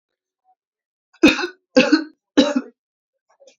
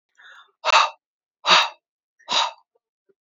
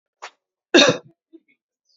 {
  "three_cough_length": "3.6 s",
  "three_cough_amplitude": 27880,
  "three_cough_signal_mean_std_ratio": 0.32,
  "exhalation_length": "3.2 s",
  "exhalation_amplitude": 27391,
  "exhalation_signal_mean_std_ratio": 0.34,
  "cough_length": "2.0 s",
  "cough_amplitude": 32557,
  "cough_signal_mean_std_ratio": 0.26,
  "survey_phase": "beta (2021-08-13 to 2022-03-07)",
  "age": "18-44",
  "gender": "Female",
  "wearing_mask": "No",
  "symptom_none": true,
  "smoker_status": "Ex-smoker",
  "respiratory_condition_asthma": false,
  "respiratory_condition_other": false,
  "recruitment_source": "REACT",
  "submission_delay": "4 days",
  "covid_test_result": "Negative",
  "covid_test_method": "RT-qPCR",
  "influenza_a_test_result": "Negative",
  "influenza_b_test_result": "Negative"
}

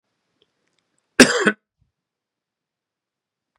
{
  "cough_length": "3.6 s",
  "cough_amplitude": 32768,
  "cough_signal_mean_std_ratio": 0.18,
  "survey_phase": "beta (2021-08-13 to 2022-03-07)",
  "age": "45-64",
  "gender": "Male",
  "wearing_mask": "No",
  "symptom_cough_any": true,
  "symptom_runny_or_blocked_nose": true,
  "symptom_fatigue": true,
  "symptom_headache": true,
  "symptom_onset": "4 days",
  "smoker_status": "Never smoked",
  "respiratory_condition_asthma": false,
  "respiratory_condition_other": false,
  "recruitment_source": "Test and Trace",
  "submission_delay": "2 days",
  "covid_test_result": "Positive",
  "covid_test_method": "ePCR"
}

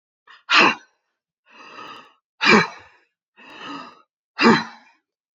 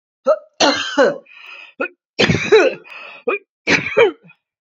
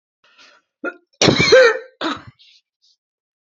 {
  "exhalation_length": "5.4 s",
  "exhalation_amplitude": 28228,
  "exhalation_signal_mean_std_ratio": 0.31,
  "three_cough_length": "4.6 s",
  "three_cough_amplitude": 29502,
  "three_cough_signal_mean_std_ratio": 0.5,
  "cough_length": "3.4 s",
  "cough_amplitude": 32768,
  "cough_signal_mean_std_ratio": 0.36,
  "survey_phase": "beta (2021-08-13 to 2022-03-07)",
  "age": "65+",
  "gender": "Female",
  "wearing_mask": "No",
  "symptom_none": true,
  "smoker_status": "Never smoked",
  "respiratory_condition_asthma": false,
  "respiratory_condition_other": false,
  "recruitment_source": "REACT",
  "submission_delay": "1 day",
  "covid_test_result": "Negative",
  "covid_test_method": "RT-qPCR",
  "influenza_a_test_result": "Negative",
  "influenza_b_test_result": "Negative"
}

